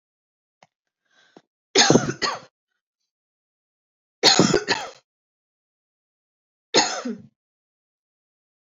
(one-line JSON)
{"three_cough_length": "8.8 s", "three_cough_amplitude": 32768, "three_cough_signal_mean_std_ratio": 0.28, "survey_phase": "beta (2021-08-13 to 2022-03-07)", "age": "18-44", "gender": "Male", "wearing_mask": "No", "symptom_cough_any": true, "symptom_sore_throat": true, "symptom_headache": true, "symptom_onset": "8 days", "smoker_status": "Never smoked", "respiratory_condition_asthma": false, "respiratory_condition_other": false, "recruitment_source": "REACT", "submission_delay": "16 days", "covid_test_result": "Negative", "covid_test_method": "RT-qPCR", "influenza_a_test_result": "Negative", "influenza_b_test_result": "Negative"}